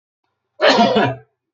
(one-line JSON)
{"cough_length": "1.5 s", "cough_amplitude": 30357, "cough_signal_mean_std_ratio": 0.5, "survey_phase": "beta (2021-08-13 to 2022-03-07)", "age": "45-64", "gender": "Male", "wearing_mask": "No", "symptom_cough_any": true, "smoker_status": "Never smoked", "respiratory_condition_asthma": false, "respiratory_condition_other": false, "recruitment_source": "Test and Trace", "submission_delay": "2 days", "covid_test_result": "Positive", "covid_test_method": "LFT"}